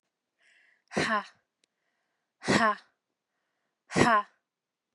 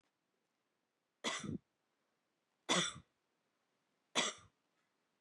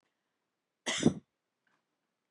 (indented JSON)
{
  "exhalation_length": "4.9 s",
  "exhalation_amplitude": 12296,
  "exhalation_signal_mean_std_ratio": 0.32,
  "three_cough_length": "5.2 s",
  "three_cough_amplitude": 3180,
  "three_cough_signal_mean_std_ratio": 0.28,
  "cough_length": "2.3 s",
  "cough_amplitude": 8535,
  "cough_signal_mean_std_ratio": 0.22,
  "survey_phase": "beta (2021-08-13 to 2022-03-07)",
  "age": "18-44",
  "gender": "Female",
  "wearing_mask": "No",
  "symptom_none": true,
  "smoker_status": "Never smoked",
  "respiratory_condition_asthma": false,
  "respiratory_condition_other": false,
  "recruitment_source": "REACT",
  "submission_delay": "4 days",
  "covid_test_result": "Negative",
  "covid_test_method": "RT-qPCR",
  "influenza_a_test_result": "Negative",
  "influenza_b_test_result": "Negative"
}